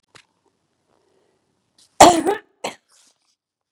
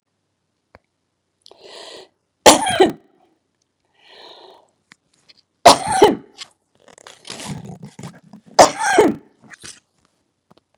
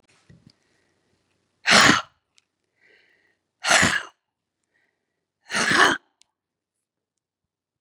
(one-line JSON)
{"cough_length": "3.7 s", "cough_amplitude": 32768, "cough_signal_mean_std_ratio": 0.21, "three_cough_length": "10.8 s", "three_cough_amplitude": 32768, "three_cough_signal_mean_std_ratio": 0.26, "exhalation_length": "7.8 s", "exhalation_amplitude": 31275, "exhalation_signal_mean_std_ratio": 0.28, "survey_phase": "beta (2021-08-13 to 2022-03-07)", "age": "65+", "gender": "Female", "wearing_mask": "No", "symptom_runny_or_blocked_nose": true, "symptom_sore_throat": true, "symptom_fatigue": true, "symptom_other": true, "symptom_onset": "2 days", "smoker_status": "Never smoked", "respiratory_condition_asthma": true, "respiratory_condition_other": false, "recruitment_source": "Test and Trace", "submission_delay": "1 day", "covid_test_result": "Negative", "covid_test_method": "RT-qPCR"}